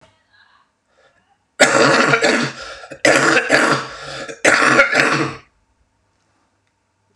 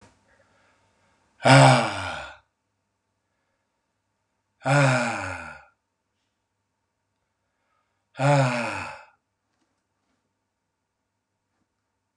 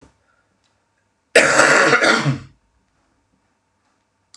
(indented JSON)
{
  "three_cough_length": "7.2 s",
  "three_cough_amplitude": 32768,
  "three_cough_signal_mean_std_ratio": 0.51,
  "exhalation_length": "12.2 s",
  "exhalation_amplitude": 28709,
  "exhalation_signal_mean_std_ratio": 0.29,
  "cough_length": "4.4 s",
  "cough_amplitude": 32768,
  "cough_signal_mean_std_ratio": 0.39,
  "survey_phase": "beta (2021-08-13 to 2022-03-07)",
  "age": "45-64",
  "gender": "Male",
  "wearing_mask": "No",
  "symptom_cough_any": true,
  "symptom_runny_or_blocked_nose": true,
  "symptom_fatigue": true,
  "symptom_headache": true,
  "symptom_change_to_sense_of_smell_or_taste": true,
  "symptom_loss_of_taste": true,
  "symptom_onset": "3 days",
  "smoker_status": "Ex-smoker",
  "respiratory_condition_asthma": true,
  "respiratory_condition_other": false,
  "recruitment_source": "Test and Trace",
  "submission_delay": "2 days",
  "covid_test_result": "Positive",
  "covid_test_method": "RT-qPCR",
  "covid_ct_value": 17.5,
  "covid_ct_gene": "ORF1ab gene"
}